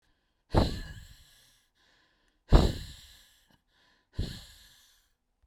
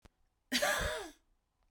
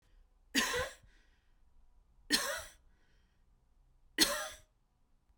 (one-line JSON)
{"exhalation_length": "5.5 s", "exhalation_amplitude": 21673, "exhalation_signal_mean_std_ratio": 0.25, "cough_length": "1.7 s", "cough_amplitude": 4106, "cough_signal_mean_std_ratio": 0.47, "three_cough_length": "5.4 s", "three_cough_amplitude": 8101, "three_cough_signal_mean_std_ratio": 0.34, "survey_phase": "beta (2021-08-13 to 2022-03-07)", "age": "45-64", "gender": "Female", "wearing_mask": "No", "symptom_cough_any": true, "symptom_shortness_of_breath": true, "smoker_status": "Ex-smoker", "respiratory_condition_asthma": false, "respiratory_condition_other": false, "recruitment_source": "REACT", "submission_delay": "1 day", "covid_test_result": "Negative", "covid_test_method": "RT-qPCR"}